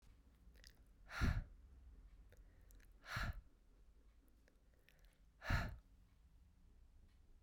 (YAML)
exhalation_length: 7.4 s
exhalation_amplitude: 1551
exhalation_signal_mean_std_ratio: 0.37
survey_phase: beta (2021-08-13 to 2022-03-07)
age: 18-44
gender: Female
wearing_mask: 'No'
symptom_cough_any: true
symptom_new_continuous_cough: true
symptom_fatigue: true
symptom_fever_high_temperature: true
symptom_headache: true
symptom_onset: 3 days
smoker_status: Ex-smoker
respiratory_condition_asthma: false
respiratory_condition_other: false
recruitment_source: Test and Trace
submission_delay: 1 day
covid_test_result: Positive
covid_test_method: RT-qPCR
covid_ct_value: 16.8
covid_ct_gene: ORF1ab gene
covid_ct_mean: 17.5
covid_viral_load: 1800000 copies/ml
covid_viral_load_category: High viral load (>1M copies/ml)